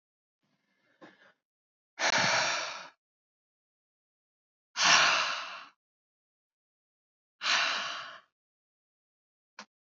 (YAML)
exhalation_length: 9.9 s
exhalation_amplitude: 14057
exhalation_signal_mean_std_ratio: 0.35
survey_phase: alpha (2021-03-01 to 2021-08-12)
age: 18-44
gender: Male
wearing_mask: 'No'
symptom_cough_any: true
symptom_change_to_sense_of_smell_or_taste: true
symptom_onset: 3 days
smoker_status: Never smoked
respiratory_condition_asthma: false
respiratory_condition_other: false
recruitment_source: Test and Trace
submission_delay: 2 days
covid_test_result: Positive
covid_test_method: RT-qPCR